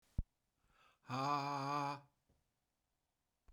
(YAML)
exhalation_length: 3.5 s
exhalation_amplitude: 1942
exhalation_signal_mean_std_ratio: 0.42
survey_phase: beta (2021-08-13 to 2022-03-07)
age: 45-64
gender: Male
wearing_mask: 'No'
symptom_runny_or_blocked_nose: true
symptom_fatigue: true
symptom_headache: true
symptom_onset: 12 days
smoker_status: Ex-smoker
respiratory_condition_asthma: false
respiratory_condition_other: false
recruitment_source: REACT
submission_delay: 2 days
covid_test_result: Negative
covid_test_method: RT-qPCR
influenza_a_test_result: Negative
influenza_b_test_result: Negative